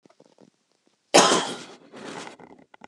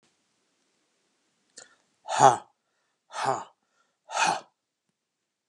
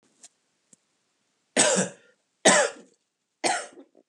{
  "cough_length": "2.9 s",
  "cough_amplitude": 25896,
  "cough_signal_mean_std_ratio": 0.3,
  "exhalation_length": "5.5 s",
  "exhalation_amplitude": 23376,
  "exhalation_signal_mean_std_ratio": 0.24,
  "three_cough_length": "4.1 s",
  "three_cough_amplitude": 20450,
  "three_cough_signal_mean_std_ratio": 0.33,
  "survey_phase": "alpha (2021-03-01 to 2021-08-12)",
  "age": "45-64",
  "gender": "Male",
  "wearing_mask": "No",
  "symptom_none": true,
  "smoker_status": "Never smoked",
  "respiratory_condition_asthma": false,
  "respiratory_condition_other": false,
  "recruitment_source": "REACT",
  "submission_delay": "5 days",
  "covid_test_result": "Negative",
  "covid_test_method": "RT-qPCR"
}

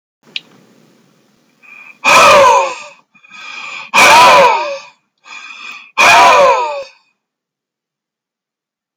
{
  "exhalation_length": "9.0 s",
  "exhalation_amplitude": 32768,
  "exhalation_signal_mean_std_ratio": 0.48,
  "survey_phase": "alpha (2021-03-01 to 2021-08-12)",
  "age": "65+",
  "gender": "Male",
  "wearing_mask": "No",
  "symptom_none": true,
  "smoker_status": "Never smoked",
  "respiratory_condition_asthma": false,
  "respiratory_condition_other": false,
  "recruitment_source": "REACT",
  "submission_delay": "1 day",
  "covid_test_result": "Negative",
  "covid_test_method": "RT-qPCR"
}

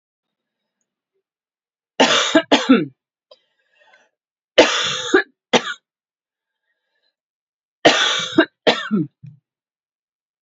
{
  "three_cough_length": "10.4 s",
  "three_cough_amplitude": 31450,
  "three_cough_signal_mean_std_ratio": 0.34,
  "survey_phase": "alpha (2021-03-01 to 2021-08-12)",
  "age": "45-64",
  "gender": "Female",
  "wearing_mask": "No",
  "symptom_cough_any": true,
  "symptom_headache": true,
  "symptom_onset": "3 days",
  "smoker_status": "Never smoked",
  "respiratory_condition_asthma": false,
  "respiratory_condition_other": false,
  "recruitment_source": "Test and Trace",
  "submission_delay": "1 day",
  "covid_test_result": "Positive",
  "covid_test_method": "RT-qPCR",
  "covid_ct_value": 17.5,
  "covid_ct_gene": "ORF1ab gene",
  "covid_ct_mean": 18.1,
  "covid_viral_load": "1100000 copies/ml",
  "covid_viral_load_category": "High viral load (>1M copies/ml)"
}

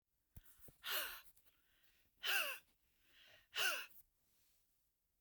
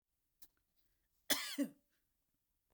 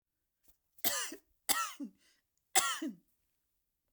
{
  "exhalation_length": "5.2 s",
  "exhalation_amplitude": 1567,
  "exhalation_signal_mean_std_ratio": 0.37,
  "cough_length": "2.7 s",
  "cough_amplitude": 3739,
  "cough_signal_mean_std_ratio": 0.26,
  "three_cough_length": "3.9 s",
  "three_cough_amplitude": 8951,
  "three_cough_signal_mean_std_ratio": 0.34,
  "survey_phase": "beta (2021-08-13 to 2022-03-07)",
  "age": "65+",
  "gender": "Female",
  "wearing_mask": "No",
  "symptom_none": true,
  "smoker_status": "Never smoked",
  "respiratory_condition_asthma": false,
  "respiratory_condition_other": false,
  "recruitment_source": "REACT",
  "submission_delay": "1 day",
  "covid_test_result": "Negative",
  "covid_test_method": "RT-qPCR",
  "influenza_a_test_result": "Negative",
  "influenza_b_test_result": "Negative"
}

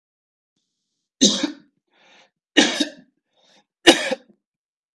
{
  "three_cough_length": "4.9 s",
  "three_cough_amplitude": 32768,
  "three_cough_signal_mean_std_ratio": 0.27,
  "survey_phase": "beta (2021-08-13 to 2022-03-07)",
  "age": "45-64",
  "gender": "Male",
  "wearing_mask": "No",
  "symptom_runny_or_blocked_nose": true,
  "smoker_status": "Never smoked",
  "respiratory_condition_asthma": false,
  "respiratory_condition_other": false,
  "recruitment_source": "REACT",
  "submission_delay": "1 day",
  "covid_test_result": "Negative",
  "covid_test_method": "RT-qPCR",
  "influenza_a_test_result": "Negative",
  "influenza_b_test_result": "Negative"
}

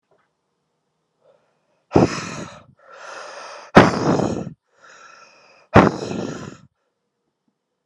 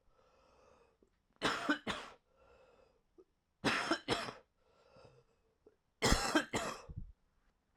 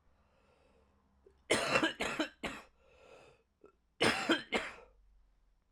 {
  "exhalation_length": "7.9 s",
  "exhalation_amplitude": 32768,
  "exhalation_signal_mean_std_ratio": 0.3,
  "three_cough_length": "7.8 s",
  "three_cough_amplitude": 6784,
  "three_cough_signal_mean_std_ratio": 0.37,
  "cough_length": "5.7 s",
  "cough_amplitude": 6750,
  "cough_signal_mean_std_ratio": 0.38,
  "survey_phase": "alpha (2021-03-01 to 2021-08-12)",
  "age": "18-44",
  "gender": "Male",
  "wearing_mask": "No",
  "symptom_cough_any": true,
  "symptom_new_continuous_cough": true,
  "symptom_abdominal_pain": true,
  "symptom_fatigue": true,
  "symptom_headache": true,
  "symptom_change_to_sense_of_smell_or_taste": true,
  "symptom_onset": "7 days",
  "smoker_status": "Current smoker (e-cigarettes or vapes only)",
  "respiratory_condition_asthma": false,
  "respiratory_condition_other": false,
  "recruitment_source": "Test and Trace",
  "submission_delay": "2 days",
  "covid_test_result": "Positive",
  "covid_test_method": "RT-qPCR",
  "covid_ct_value": 16.4,
  "covid_ct_gene": "ORF1ab gene",
  "covid_ct_mean": 16.6,
  "covid_viral_load": "3700000 copies/ml",
  "covid_viral_load_category": "High viral load (>1M copies/ml)"
}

